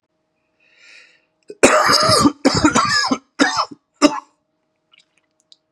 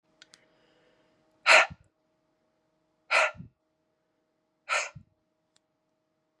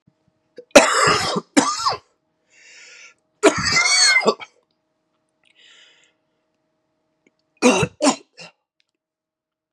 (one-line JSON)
{"cough_length": "5.7 s", "cough_amplitude": 32768, "cough_signal_mean_std_ratio": 0.45, "exhalation_length": "6.4 s", "exhalation_amplitude": 19138, "exhalation_signal_mean_std_ratio": 0.22, "three_cough_length": "9.7 s", "three_cough_amplitude": 32768, "three_cough_signal_mean_std_ratio": 0.36, "survey_phase": "beta (2021-08-13 to 2022-03-07)", "age": "18-44", "gender": "Male", "wearing_mask": "No", "symptom_cough_any": true, "symptom_runny_or_blocked_nose": true, "symptom_sore_throat": true, "symptom_fatigue": true, "symptom_headache": true, "symptom_onset": "4 days", "smoker_status": "Never smoked", "respiratory_condition_asthma": false, "respiratory_condition_other": false, "recruitment_source": "Test and Trace", "submission_delay": "1 day", "covid_test_result": "Positive", "covid_test_method": "RT-qPCR", "covid_ct_value": 15.4, "covid_ct_gene": "ORF1ab gene", "covid_ct_mean": 15.6, "covid_viral_load": "7700000 copies/ml", "covid_viral_load_category": "High viral load (>1M copies/ml)"}